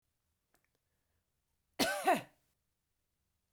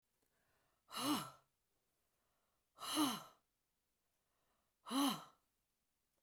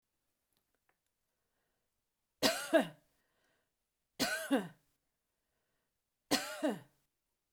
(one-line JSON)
{"cough_length": "3.5 s", "cough_amplitude": 4940, "cough_signal_mean_std_ratio": 0.25, "exhalation_length": "6.2 s", "exhalation_amplitude": 1761, "exhalation_signal_mean_std_ratio": 0.33, "three_cough_length": "7.5 s", "three_cough_amplitude": 6793, "three_cough_signal_mean_std_ratio": 0.28, "survey_phase": "beta (2021-08-13 to 2022-03-07)", "age": "45-64", "gender": "Female", "wearing_mask": "No", "symptom_none": true, "smoker_status": "Ex-smoker", "respiratory_condition_asthma": false, "respiratory_condition_other": false, "recruitment_source": "REACT", "submission_delay": "2 days", "covid_test_result": "Negative", "covid_test_method": "RT-qPCR"}